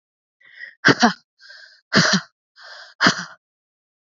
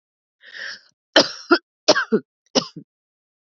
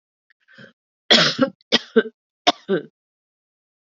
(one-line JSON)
{"exhalation_length": "4.1 s", "exhalation_amplitude": 32768, "exhalation_signal_mean_std_ratio": 0.33, "cough_length": "3.4 s", "cough_amplitude": 30373, "cough_signal_mean_std_ratio": 0.3, "three_cough_length": "3.8 s", "three_cough_amplitude": 31479, "three_cough_signal_mean_std_ratio": 0.31, "survey_phase": "beta (2021-08-13 to 2022-03-07)", "age": "45-64", "gender": "Female", "wearing_mask": "No", "symptom_cough_any": true, "symptom_runny_or_blocked_nose": true, "symptom_shortness_of_breath": true, "symptom_sore_throat": true, "symptom_fatigue": true, "symptom_headache": true, "symptom_onset": "3 days", "smoker_status": "Ex-smoker", "respiratory_condition_asthma": false, "respiratory_condition_other": false, "recruitment_source": "Test and Trace", "submission_delay": "1 day", "covid_test_result": "Positive", "covid_test_method": "RT-qPCR", "covid_ct_value": 24.3, "covid_ct_gene": "ORF1ab gene"}